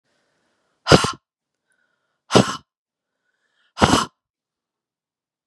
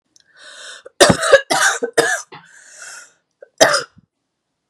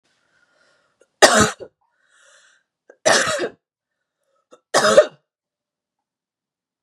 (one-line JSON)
{"exhalation_length": "5.5 s", "exhalation_amplitude": 32768, "exhalation_signal_mean_std_ratio": 0.23, "cough_length": "4.7 s", "cough_amplitude": 32768, "cough_signal_mean_std_ratio": 0.38, "three_cough_length": "6.8 s", "three_cough_amplitude": 32768, "three_cough_signal_mean_std_ratio": 0.28, "survey_phase": "beta (2021-08-13 to 2022-03-07)", "age": "45-64", "gender": "Female", "wearing_mask": "No", "symptom_cough_any": true, "symptom_runny_or_blocked_nose": true, "symptom_sore_throat": true, "symptom_fatigue": true, "symptom_headache": true, "symptom_onset": "6 days", "smoker_status": "Never smoked", "respiratory_condition_asthma": false, "respiratory_condition_other": false, "recruitment_source": "Test and Trace", "submission_delay": "2 days", "covid_test_result": "Positive", "covid_test_method": "RT-qPCR", "covid_ct_value": 16.5, "covid_ct_gene": "ORF1ab gene"}